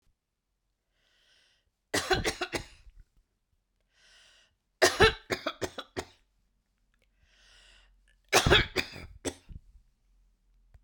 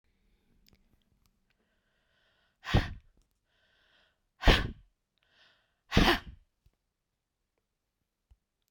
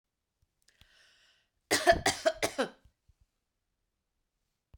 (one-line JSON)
{"three_cough_length": "10.8 s", "three_cough_amplitude": 17247, "three_cough_signal_mean_std_ratio": 0.27, "exhalation_length": "8.7 s", "exhalation_amplitude": 14812, "exhalation_signal_mean_std_ratio": 0.21, "cough_length": "4.8 s", "cough_amplitude": 10760, "cough_signal_mean_std_ratio": 0.26, "survey_phase": "beta (2021-08-13 to 2022-03-07)", "age": "65+", "gender": "Female", "wearing_mask": "No", "symptom_runny_or_blocked_nose": true, "symptom_fatigue": true, "symptom_onset": "5 days", "smoker_status": "Never smoked", "respiratory_condition_asthma": false, "respiratory_condition_other": false, "recruitment_source": "Test and Trace", "submission_delay": "1 day", "covid_test_result": "Positive", "covid_test_method": "RT-qPCR", "covid_ct_value": 20.4, "covid_ct_gene": "ORF1ab gene"}